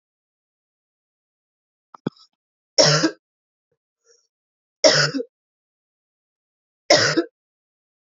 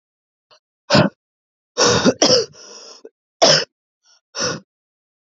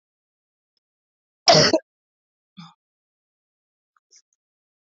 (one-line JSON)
{"three_cough_length": "8.2 s", "three_cough_amplitude": 32767, "three_cough_signal_mean_std_ratio": 0.26, "exhalation_length": "5.3 s", "exhalation_amplitude": 32108, "exhalation_signal_mean_std_ratio": 0.38, "cough_length": "4.9 s", "cough_amplitude": 28315, "cough_signal_mean_std_ratio": 0.19, "survey_phase": "beta (2021-08-13 to 2022-03-07)", "age": "18-44", "gender": "Female", "wearing_mask": "No", "symptom_cough_any": true, "symptom_runny_or_blocked_nose": true, "symptom_sore_throat": true, "symptom_headache": true, "symptom_other": true, "symptom_onset": "3 days", "smoker_status": "Ex-smoker", "respiratory_condition_asthma": false, "respiratory_condition_other": false, "recruitment_source": "Test and Trace", "submission_delay": "1 day", "covid_test_result": "Positive", "covid_test_method": "RT-qPCR", "covid_ct_value": 27.3, "covid_ct_gene": "ORF1ab gene", "covid_ct_mean": 27.7, "covid_viral_load": "830 copies/ml", "covid_viral_load_category": "Minimal viral load (< 10K copies/ml)"}